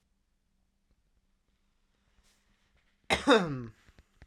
{"cough_length": "4.3 s", "cough_amplitude": 12109, "cough_signal_mean_std_ratio": 0.23, "survey_phase": "beta (2021-08-13 to 2022-03-07)", "age": "18-44", "gender": "Male", "wearing_mask": "No", "symptom_cough_any": true, "symptom_new_continuous_cough": true, "symptom_runny_or_blocked_nose": true, "symptom_sore_throat": true, "symptom_change_to_sense_of_smell_or_taste": true, "symptom_onset": "2 days", "smoker_status": "Never smoked", "respiratory_condition_asthma": false, "respiratory_condition_other": false, "recruitment_source": "Test and Trace", "submission_delay": "1 day", "covid_test_result": "Positive", "covid_test_method": "RT-qPCR", "covid_ct_value": 25.5, "covid_ct_gene": "N gene"}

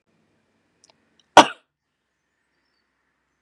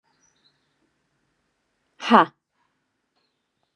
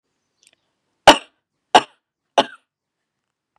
{"cough_length": "3.4 s", "cough_amplitude": 32768, "cough_signal_mean_std_ratio": 0.11, "exhalation_length": "3.8 s", "exhalation_amplitude": 32264, "exhalation_signal_mean_std_ratio": 0.16, "three_cough_length": "3.6 s", "three_cough_amplitude": 32768, "three_cough_signal_mean_std_ratio": 0.17, "survey_phase": "beta (2021-08-13 to 2022-03-07)", "age": "45-64", "gender": "Female", "wearing_mask": "No", "symptom_none": true, "smoker_status": "Never smoked", "respiratory_condition_asthma": false, "respiratory_condition_other": false, "recruitment_source": "REACT", "submission_delay": "4 days", "covid_test_result": "Negative", "covid_test_method": "RT-qPCR", "influenza_a_test_result": "Negative", "influenza_b_test_result": "Negative"}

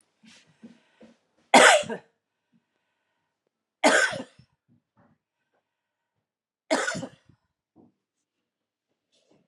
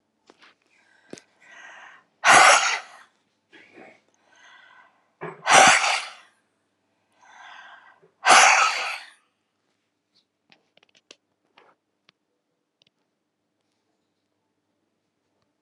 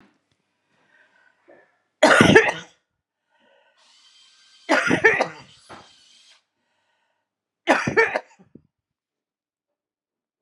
{"cough_length": "9.5 s", "cough_amplitude": 27739, "cough_signal_mean_std_ratio": 0.22, "exhalation_length": "15.6 s", "exhalation_amplitude": 30491, "exhalation_signal_mean_std_ratio": 0.26, "three_cough_length": "10.4 s", "three_cough_amplitude": 32541, "three_cough_signal_mean_std_ratio": 0.28, "survey_phase": "alpha (2021-03-01 to 2021-08-12)", "age": "65+", "gender": "Female", "wearing_mask": "No", "symptom_none": true, "symptom_onset": "8 days", "smoker_status": "Never smoked", "respiratory_condition_asthma": true, "respiratory_condition_other": false, "recruitment_source": "REACT", "submission_delay": "3 days", "covid_test_result": "Negative", "covid_test_method": "RT-qPCR"}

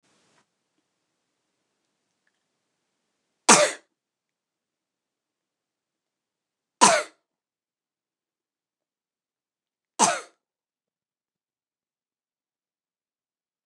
{"three_cough_length": "13.7 s", "three_cough_amplitude": 29188, "three_cough_signal_mean_std_ratio": 0.15, "survey_phase": "beta (2021-08-13 to 2022-03-07)", "age": "45-64", "gender": "Female", "wearing_mask": "No", "symptom_none": true, "smoker_status": "Never smoked", "respiratory_condition_asthma": false, "respiratory_condition_other": false, "recruitment_source": "REACT", "submission_delay": "3 days", "covid_test_result": "Negative", "covid_test_method": "RT-qPCR", "influenza_a_test_result": "Negative", "influenza_b_test_result": "Negative"}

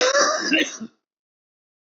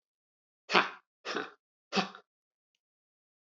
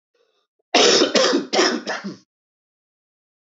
{"cough_length": "2.0 s", "cough_amplitude": 17377, "cough_signal_mean_std_ratio": 0.51, "exhalation_length": "3.5 s", "exhalation_amplitude": 15542, "exhalation_signal_mean_std_ratio": 0.24, "three_cough_length": "3.6 s", "three_cough_amplitude": 25430, "three_cough_signal_mean_std_ratio": 0.45, "survey_phase": "alpha (2021-03-01 to 2021-08-12)", "age": "45-64", "gender": "Male", "wearing_mask": "No", "symptom_shortness_of_breath": true, "symptom_abdominal_pain": true, "symptom_fatigue": true, "symptom_fever_high_temperature": true, "symptom_headache": true, "symptom_change_to_sense_of_smell_or_taste": true, "symptom_onset": "6 days", "smoker_status": "Never smoked", "respiratory_condition_asthma": false, "respiratory_condition_other": false, "recruitment_source": "Test and Trace", "submission_delay": "2 days", "covid_test_result": "Positive", "covid_test_method": "RT-qPCR", "covid_ct_value": 25.5, "covid_ct_gene": "N gene"}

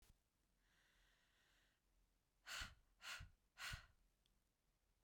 {"exhalation_length": "5.0 s", "exhalation_amplitude": 383, "exhalation_signal_mean_std_ratio": 0.37, "survey_phase": "beta (2021-08-13 to 2022-03-07)", "age": "18-44", "gender": "Female", "wearing_mask": "No", "symptom_cough_any": true, "symptom_new_continuous_cough": true, "smoker_status": "Never smoked", "respiratory_condition_asthma": false, "respiratory_condition_other": false, "recruitment_source": "Test and Trace", "submission_delay": "2 days", "covid_test_result": "Positive", "covid_test_method": "RT-qPCR"}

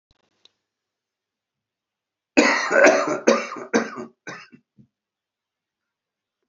{"cough_length": "6.5 s", "cough_amplitude": 27396, "cough_signal_mean_std_ratio": 0.32, "survey_phase": "alpha (2021-03-01 to 2021-08-12)", "age": "65+", "gender": "Male", "wearing_mask": "No", "symptom_none": true, "smoker_status": "Ex-smoker", "respiratory_condition_asthma": true, "respiratory_condition_other": true, "recruitment_source": "REACT", "submission_delay": "5 days", "covid_test_result": "Negative", "covid_test_method": "RT-qPCR"}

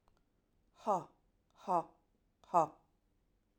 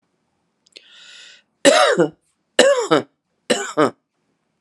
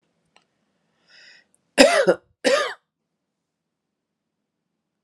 {"exhalation_length": "3.6 s", "exhalation_amplitude": 5061, "exhalation_signal_mean_std_ratio": 0.26, "three_cough_length": "4.6 s", "three_cough_amplitude": 32767, "three_cough_signal_mean_std_ratio": 0.38, "cough_length": "5.0 s", "cough_amplitude": 32768, "cough_signal_mean_std_ratio": 0.26, "survey_phase": "alpha (2021-03-01 to 2021-08-12)", "age": "45-64", "gender": "Female", "wearing_mask": "No", "symptom_none": true, "smoker_status": "Never smoked", "respiratory_condition_asthma": false, "respiratory_condition_other": false, "recruitment_source": "REACT", "submission_delay": "2 days", "covid_test_result": "Negative", "covid_test_method": "RT-qPCR"}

